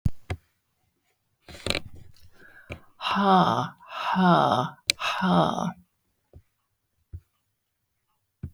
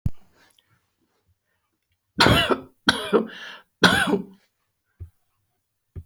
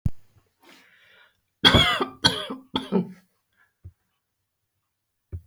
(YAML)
exhalation_length: 8.5 s
exhalation_amplitude: 31202
exhalation_signal_mean_std_ratio: 0.44
three_cough_length: 6.1 s
three_cough_amplitude: 26940
three_cough_signal_mean_std_ratio: 0.34
cough_length: 5.5 s
cough_amplitude: 28339
cough_signal_mean_std_ratio: 0.32
survey_phase: beta (2021-08-13 to 2022-03-07)
age: 65+
gender: Female
wearing_mask: 'No'
symptom_none: true
smoker_status: Never smoked
respiratory_condition_asthma: false
respiratory_condition_other: false
recruitment_source: REACT
submission_delay: 1 day
covid_test_result: Negative
covid_test_method: RT-qPCR
influenza_a_test_result: Negative
influenza_b_test_result: Negative